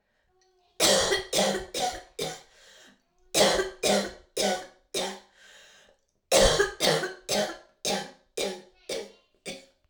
three_cough_length: 9.9 s
three_cough_amplitude: 15034
three_cough_signal_mean_std_ratio: 0.49
survey_phase: alpha (2021-03-01 to 2021-08-12)
age: 18-44
gender: Female
wearing_mask: 'No'
symptom_cough_any: true
symptom_fatigue: true
symptom_change_to_sense_of_smell_or_taste: true
symptom_loss_of_taste: true
symptom_onset: 4 days
smoker_status: Never smoked
respiratory_condition_asthma: false
respiratory_condition_other: false
recruitment_source: Test and Trace
submission_delay: 1 day
covid_test_result: Positive
covid_test_method: RT-qPCR
covid_ct_value: 14.6
covid_ct_gene: N gene
covid_ct_mean: 14.9
covid_viral_load: 13000000 copies/ml
covid_viral_load_category: High viral load (>1M copies/ml)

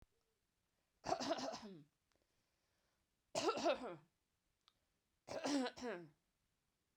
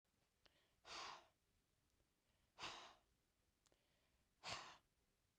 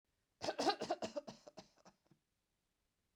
three_cough_length: 7.0 s
three_cough_amplitude: 1761
three_cough_signal_mean_std_ratio: 0.39
exhalation_length: 5.4 s
exhalation_amplitude: 553
exhalation_signal_mean_std_ratio: 0.38
cough_length: 3.2 s
cough_amplitude: 2546
cough_signal_mean_std_ratio: 0.34
survey_phase: beta (2021-08-13 to 2022-03-07)
age: 45-64
gender: Female
wearing_mask: 'No'
symptom_headache: true
symptom_onset: 12 days
smoker_status: Never smoked
respiratory_condition_asthma: false
respiratory_condition_other: false
recruitment_source: REACT
submission_delay: 1 day
covid_test_result: Negative
covid_test_method: RT-qPCR
influenza_a_test_result: Negative
influenza_b_test_result: Negative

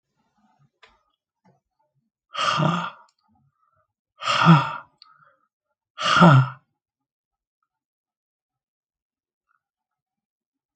exhalation_length: 10.8 s
exhalation_amplitude: 27063
exhalation_signal_mean_std_ratio: 0.26
survey_phase: alpha (2021-03-01 to 2021-08-12)
age: 65+
gender: Male
wearing_mask: 'No'
symptom_cough_any: true
smoker_status: Ex-smoker
respiratory_condition_asthma: false
respiratory_condition_other: false
recruitment_source: REACT
submission_delay: 3 days
covid_test_result: Negative
covid_test_method: RT-qPCR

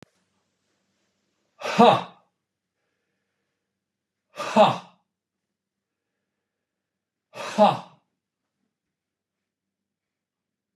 exhalation_length: 10.8 s
exhalation_amplitude: 24530
exhalation_signal_mean_std_ratio: 0.21
survey_phase: beta (2021-08-13 to 2022-03-07)
age: 65+
gender: Male
wearing_mask: 'No'
symptom_none: true
smoker_status: Ex-smoker
respiratory_condition_asthma: false
respiratory_condition_other: false
recruitment_source: REACT
submission_delay: 1 day
covid_test_result: Negative
covid_test_method: RT-qPCR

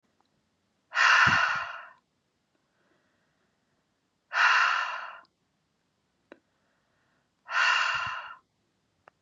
exhalation_length: 9.2 s
exhalation_amplitude: 12380
exhalation_signal_mean_std_ratio: 0.38
survey_phase: beta (2021-08-13 to 2022-03-07)
age: 45-64
gender: Female
wearing_mask: 'No'
symptom_shortness_of_breath: true
symptom_sore_throat: true
symptom_fatigue: true
symptom_headache: true
smoker_status: Never smoked
respiratory_condition_asthma: false
respiratory_condition_other: false
recruitment_source: Test and Trace
submission_delay: 2 days
covid_test_result: Positive
covid_test_method: RT-qPCR
covid_ct_value: 20.2
covid_ct_gene: ORF1ab gene
covid_ct_mean: 20.7
covid_viral_load: 160000 copies/ml
covid_viral_load_category: Low viral load (10K-1M copies/ml)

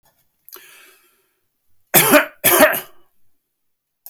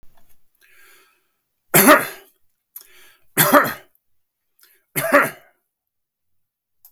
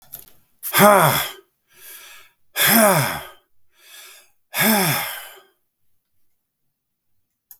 cough_length: 4.1 s
cough_amplitude: 32768
cough_signal_mean_std_ratio: 0.32
three_cough_length: 6.9 s
three_cough_amplitude: 32768
three_cough_signal_mean_std_ratio: 0.28
exhalation_length: 7.6 s
exhalation_amplitude: 32766
exhalation_signal_mean_std_ratio: 0.39
survey_phase: beta (2021-08-13 to 2022-03-07)
age: 65+
gender: Male
wearing_mask: 'No'
symptom_none: true
smoker_status: Never smoked
respiratory_condition_asthma: false
respiratory_condition_other: false
recruitment_source: REACT
submission_delay: 2 days
covid_test_result: Negative
covid_test_method: RT-qPCR
influenza_a_test_result: Negative
influenza_b_test_result: Negative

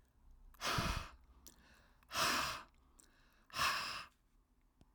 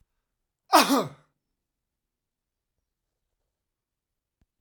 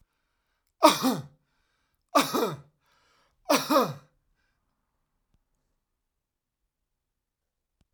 exhalation_length: 4.9 s
exhalation_amplitude: 2380
exhalation_signal_mean_std_ratio: 0.47
cough_length: 4.6 s
cough_amplitude: 21125
cough_signal_mean_std_ratio: 0.19
three_cough_length: 7.9 s
three_cough_amplitude: 23089
three_cough_signal_mean_std_ratio: 0.26
survey_phase: alpha (2021-03-01 to 2021-08-12)
age: 65+
gender: Male
wearing_mask: 'No'
symptom_none: true
smoker_status: Never smoked
respiratory_condition_asthma: false
respiratory_condition_other: false
recruitment_source: REACT
submission_delay: 1 day
covid_test_result: Negative
covid_test_method: RT-qPCR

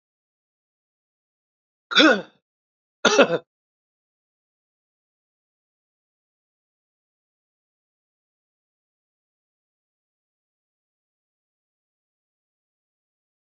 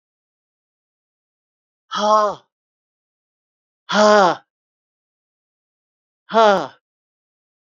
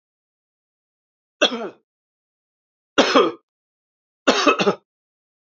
cough_length: 13.5 s
cough_amplitude: 28999
cough_signal_mean_std_ratio: 0.15
exhalation_length: 7.7 s
exhalation_amplitude: 28835
exhalation_signal_mean_std_ratio: 0.29
three_cough_length: 5.5 s
three_cough_amplitude: 28593
three_cough_signal_mean_std_ratio: 0.3
survey_phase: beta (2021-08-13 to 2022-03-07)
age: 45-64
gender: Male
wearing_mask: 'No'
symptom_none: true
smoker_status: Never smoked
respiratory_condition_asthma: false
respiratory_condition_other: false
recruitment_source: REACT
submission_delay: 2 days
covid_test_result: Negative
covid_test_method: RT-qPCR
influenza_a_test_result: Negative
influenza_b_test_result: Negative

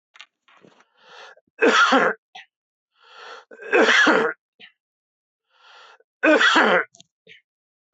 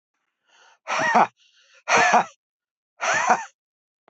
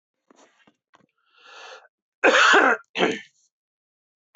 three_cough_length: 7.9 s
three_cough_amplitude: 23725
three_cough_signal_mean_std_ratio: 0.4
exhalation_length: 4.1 s
exhalation_amplitude: 20996
exhalation_signal_mean_std_ratio: 0.42
cough_length: 4.4 s
cough_amplitude: 22565
cough_signal_mean_std_ratio: 0.33
survey_phase: beta (2021-08-13 to 2022-03-07)
age: 65+
gender: Male
wearing_mask: 'No'
symptom_none: true
smoker_status: Never smoked
respiratory_condition_asthma: false
respiratory_condition_other: false
recruitment_source: REACT
submission_delay: 1 day
covid_test_result: Negative
covid_test_method: RT-qPCR
influenza_a_test_result: Negative
influenza_b_test_result: Negative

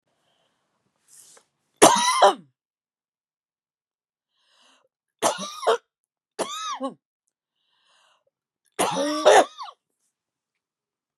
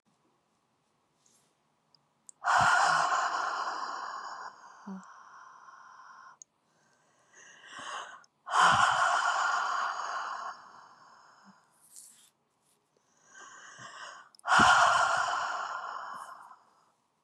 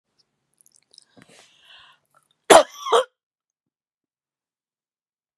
three_cough_length: 11.2 s
three_cough_amplitude: 32767
three_cough_signal_mean_std_ratio: 0.28
exhalation_length: 17.2 s
exhalation_amplitude: 10316
exhalation_signal_mean_std_ratio: 0.46
cough_length: 5.4 s
cough_amplitude: 32768
cough_signal_mean_std_ratio: 0.17
survey_phase: beta (2021-08-13 to 2022-03-07)
age: 45-64
gender: Female
wearing_mask: 'No'
symptom_cough_any: true
symptom_shortness_of_breath: true
symptom_change_to_sense_of_smell_or_taste: true
symptom_loss_of_taste: true
symptom_onset: 12 days
smoker_status: Never smoked
respiratory_condition_asthma: false
respiratory_condition_other: true
recruitment_source: REACT
submission_delay: 1 day
covid_test_result: Negative
covid_test_method: RT-qPCR
covid_ct_value: 37.0
covid_ct_gene: N gene
influenza_a_test_result: Negative
influenza_b_test_result: Negative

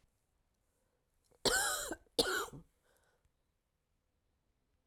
cough_length: 4.9 s
cough_amplitude: 5135
cough_signal_mean_std_ratio: 0.31
survey_phase: alpha (2021-03-01 to 2021-08-12)
age: 45-64
gender: Female
wearing_mask: 'No'
symptom_fatigue: true
symptom_change_to_sense_of_smell_or_taste: true
symptom_loss_of_taste: true
symptom_onset: 2 days
smoker_status: Ex-smoker
respiratory_condition_asthma: false
respiratory_condition_other: false
recruitment_source: Test and Trace
submission_delay: 2 days
covid_test_result: Positive
covid_test_method: RT-qPCR
covid_ct_value: 15.1
covid_ct_gene: ORF1ab gene
covid_ct_mean: 15.6
covid_viral_load: 7400000 copies/ml
covid_viral_load_category: High viral load (>1M copies/ml)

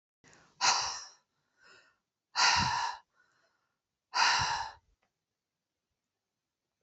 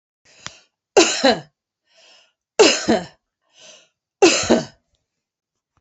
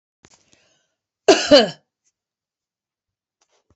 exhalation_length: 6.8 s
exhalation_amplitude: 8814
exhalation_signal_mean_std_ratio: 0.37
three_cough_length: 5.8 s
three_cough_amplitude: 30945
three_cough_signal_mean_std_ratio: 0.34
cough_length: 3.8 s
cough_amplitude: 29095
cough_signal_mean_std_ratio: 0.22
survey_phase: alpha (2021-03-01 to 2021-08-12)
age: 45-64
gender: Female
wearing_mask: 'No'
symptom_abdominal_pain: true
symptom_fatigue: true
symptom_headache: true
smoker_status: Never smoked
respiratory_condition_asthma: false
respiratory_condition_other: false
recruitment_source: REACT
submission_delay: 3 days
covid_test_result: Negative
covid_test_method: RT-qPCR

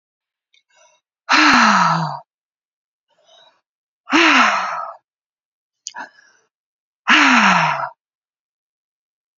exhalation_length: 9.4 s
exhalation_amplitude: 32768
exhalation_signal_mean_std_ratio: 0.41
survey_phase: beta (2021-08-13 to 2022-03-07)
age: 18-44
gender: Female
wearing_mask: 'No'
symptom_prefer_not_to_say: true
symptom_onset: 9 days
smoker_status: Current smoker (1 to 10 cigarettes per day)
respiratory_condition_asthma: false
respiratory_condition_other: false
recruitment_source: Test and Trace
submission_delay: 2 days
covid_test_result: Positive
covid_test_method: RT-qPCR
covid_ct_value: 28.6
covid_ct_gene: ORF1ab gene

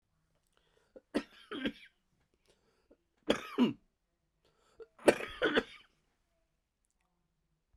three_cough_length: 7.8 s
three_cough_amplitude: 12208
three_cough_signal_mean_std_ratio: 0.24
survey_phase: beta (2021-08-13 to 2022-03-07)
age: 45-64
gender: Male
wearing_mask: 'No'
symptom_cough_any: true
symptom_new_continuous_cough: true
symptom_runny_or_blocked_nose: true
symptom_shortness_of_breath: true
symptom_sore_throat: true
symptom_diarrhoea: true
symptom_fatigue: true
symptom_headache: true
symptom_onset: 3 days
smoker_status: Ex-smoker
respiratory_condition_asthma: false
respiratory_condition_other: false
recruitment_source: Test and Trace
submission_delay: 1 day
covid_test_result: Positive
covid_test_method: RT-qPCR
covid_ct_value: 15.2
covid_ct_gene: ORF1ab gene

